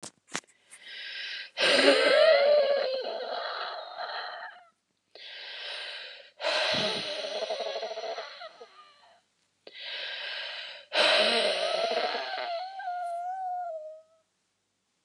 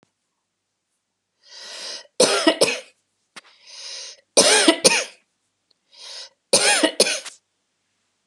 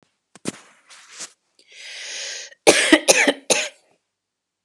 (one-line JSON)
{"exhalation_length": "15.0 s", "exhalation_amplitude": 12743, "exhalation_signal_mean_std_ratio": 0.61, "three_cough_length": "8.3 s", "three_cough_amplitude": 32738, "three_cough_signal_mean_std_ratio": 0.37, "cough_length": "4.6 s", "cough_amplitude": 32767, "cough_signal_mean_std_ratio": 0.33, "survey_phase": "beta (2021-08-13 to 2022-03-07)", "age": "45-64", "gender": "Female", "wearing_mask": "No", "symptom_none": true, "smoker_status": "Ex-smoker", "respiratory_condition_asthma": false, "respiratory_condition_other": false, "recruitment_source": "REACT", "submission_delay": "1 day", "covid_test_result": "Negative", "covid_test_method": "RT-qPCR"}